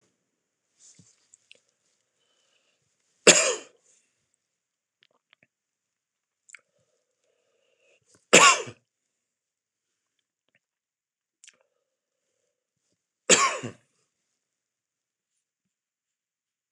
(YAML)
three_cough_length: 16.7 s
three_cough_amplitude: 26027
three_cough_signal_mean_std_ratio: 0.16
survey_phase: beta (2021-08-13 to 2022-03-07)
age: 45-64
gender: Male
wearing_mask: 'No'
symptom_cough_any: true
symptom_shortness_of_breath: true
symptom_diarrhoea: true
symptom_fatigue: true
symptom_headache: true
symptom_onset: 5 days
smoker_status: Never smoked
respiratory_condition_asthma: false
respiratory_condition_other: false
recruitment_source: Test and Trace
submission_delay: 2 days
covid_test_result: Positive
covid_test_method: RT-qPCR
covid_ct_value: 29.6
covid_ct_gene: ORF1ab gene